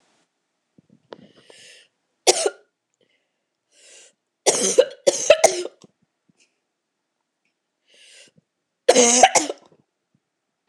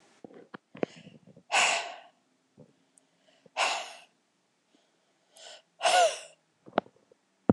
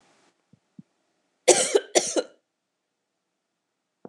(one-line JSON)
{"three_cough_length": "10.7 s", "three_cough_amplitude": 26028, "three_cough_signal_mean_std_ratio": 0.27, "exhalation_length": "7.5 s", "exhalation_amplitude": 15519, "exhalation_signal_mean_std_ratio": 0.3, "cough_length": "4.1 s", "cough_amplitude": 24801, "cough_signal_mean_std_ratio": 0.25, "survey_phase": "beta (2021-08-13 to 2022-03-07)", "age": "18-44", "gender": "Female", "wearing_mask": "No", "symptom_runny_or_blocked_nose": true, "symptom_fever_high_temperature": true, "symptom_other": true, "smoker_status": "Never smoked", "respiratory_condition_asthma": false, "respiratory_condition_other": false, "recruitment_source": "Test and Trace", "submission_delay": "1 day", "covid_test_result": "Positive", "covid_test_method": "RT-qPCR"}